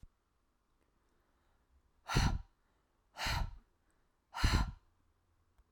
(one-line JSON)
{"exhalation_length": "5.7 s", "exhalation_amplitude": 5117, "exhalation_signal_mean_std_ratio": 0.33, "survey_phase": "alpha (2021-03-01 to 2021-08-12)", "age": "45-64", "gender": "Female", "wearing_mask": "No", "symptom_none": true, "smoker_status": "Ex-smoker", "respiratory_condition_asthma": false, "respiratory_condition_other": false, "recruitment_source": "REACT", "submission_delay": "1 day", "covid_test_result": "Negative", "covid_test_method": "RT-qPCR"}